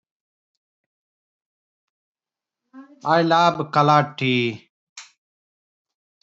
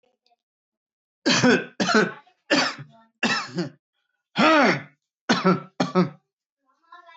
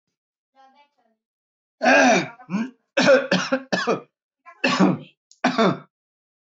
{"exhalation_length": "6.2 s", "exhalation_amplitude": 24112, "exhalation_signal_mean_std_ratio": 0.34, "cough_length": "7.2 s", "cough_amplitude": 18197, "cough_signal_mean_std_ratio": 0.44, "three_cough_length": "6.6 s", "three_cough_amplitude": 20013, "three_cough_signal_mean_std_ratio": 0.44, "survey_phase": "beta (2021-08-13 to 2022-03-07)", "age": "18-44", "gender": "Male", "wearing_mask": "Yes", "symptom_runny_or_blocked_nose": true, "symptom_headache": true, "smoker_status": "Never smoked", "respiratory_condition_asthma": false, "respiratory_condition_other": false, "recruitment_source": "Test and Trace", "submission_delay": "2 days", "covid_test_result": "Positive", "covid_test_method": "RT-qPCR"}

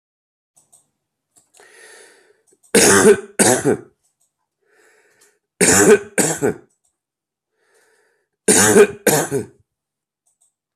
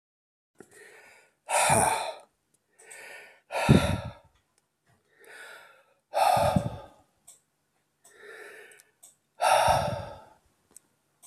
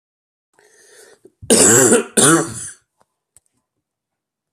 {"three_cough_length": "10.8 s", "three_cough_amplitude": 32768, "three_cough_signal_mean_std_ratio": 0.36, "exhalation_length": "11.3 s", "exhalation_amplitude": 18531, "exhalation_signal_mean_std_ratio": 0.37, "cough_length": "4.5 s", "cough_amplitude": 32768, "cough_signal_mean_std_ratio": 0.37, "survey_phase": "beta (2021-08-13 to 2022-03-07)", "age": "45-64", "gender": "Male", "wearing_mask": "No", "symptom_cough_any": true, "symptom_runny_or_blocked_nose": true, "symptom_fatigue": true, "symptom_fever_high_temperature": true, "symptom_headache": true, "symptom_onset": "4 days", "smoker_status": "Ex-smoker", "respiratory_condition_asthma": false, "respiratory_condition_other": false, "recruitment_source": "Test and Trace", "submission_delay": "1 day", "covid_test_result": "Positive", "covid_test_method": "RT-qPCR", "covid_ct_value": 38.5, "covid_ct_gene": "N gene"}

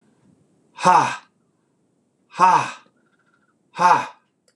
{"exhalation_length": "4.6 s", "exhalation_amplitude": 26028, "exhalation_signal_mean_std_ratio": 0.35, "survey_phase": "beta (2021-08-13 to 2022-03-07)", "age": "45-64", "gender": "Male", "wearing_mask": "No", "symptom_none": true, "smoker_status": "Never smoked", "respiratory_condition_asthma": false, "respiratory_condition_other": false, "recruitment_source": "REACT", "submission_delay": "3 days", "covid_test_result": "Negative", "covid_test_method": "RT-qPCR", "influenza_a_test_result": "Negative", "influenza_b_test_result": "Negative"}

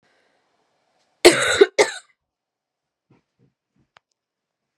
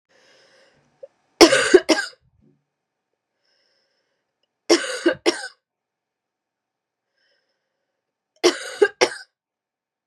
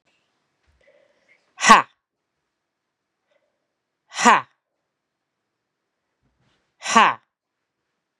{"cough_length": "4.8 s", "cough_amplitude": 32768, "cough_signal_mean_std_ratio": 0.22, "three_cough_length": "10.1 s", "three_cough_amplitude": 32768, "three_cough_signal_mean_std_ratio": 0.24, "exhalation_length": "8.2 s", "exhalation_amplitude": 32767, "exhalation_signal_mean_std_ratio": 0.2, "survey_phase": "beta (2021-08-13 to 2022-03-07)", "age": "18-44", "gender": "Female", "wearing_mask": "No", "symptom_cough_any": true, "symptom_runny_or_blocked_nose": true, "symptom_shortness_of_breath": true, "symptom_fatigue": true, "symptom_headache": true, "symptom_onset": "3 days", "smoker_status": "Ex-smoker", "respiratory_condition_asthma": true, "respiratory_condition_other": false, "recruitment_source": "Test and Trace", "submission_delay": "2 days", "covid_test_result": "Positive", "covid_test_method": "ePCR"}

